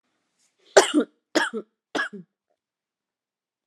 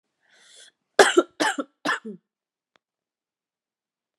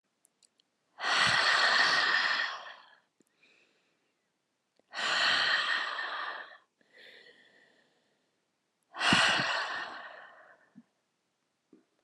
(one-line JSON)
{"three_cough_length": "3.7 s", "three_cough_amplitude": 32330, "three_cough_signal_mean_std_ratio": 0.26, "cough_length": "4.2 s", "cough_amplitude": 29601, "cough_signal_mean_std_ratio": 0.24, "exhalation_length": "12.0 s", "exhalation_amplitude": 8431, "exhalation_signal_mean_std_ratio": 0.48, "survey_phase": "alpha (2021-03-01 to 2021-08-12)", "age": "18-44", "gender": "Female", "wearing_mask": "No", "symptom_cough_any": true, "symptom_new_continuous_cough": true, "symptom_shortness_of_breath": true, "symptom_fatigue": true, "symptom_headache": true, "smoker_status": "Never smoked", "respiratory_condition_asthma": false, "respiratory_condition_other": false, "recruitment_source": "Test and Trace", "submission_delay": "3 days", "covid_test_result": "Positive", "covid_test_method": "RT-qPCR", "covid_ct_value": 31.5, "covid_ct_gene": "ORF1ab gene", "covid_ct_mean": 32.3, "covid_viral_load": "26 copies/ml", "covid_viral_load_category": "Minimal viral load (< 10K copies/ml)"}